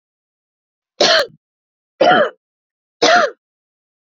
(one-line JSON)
{"three_cough_length": "4.0 s", "three_cough_amplitude": 29894, "three_cough_signal_mean_std_ratio": 0.37, "survey_phase": "beta (2021-08-13 to 2022-03-07)", "age": "45-64", "gender": "Female", "wearing_mask": "No", "symptom_cough_any": true, "symptom_new_continuous_cough": true, "symptom_runny_or_blocked_nose": true, "symptom_shortness_of_breath": true, "symptom_sore_throat": true, "symptom_fatigue": true, "symptom_fever_high_temperature": true, "symptom_headache": true, "symptom_onset": "2 days", "smoker_status": "Never smoked", "respiratory_condition_asthma": false, "respiratory_condition_other": false, "recruitment_source": "Test and Trace", "submission_delay": "1 day", "covid_test_result": "Positive", "covid_test_method": "ePCR"}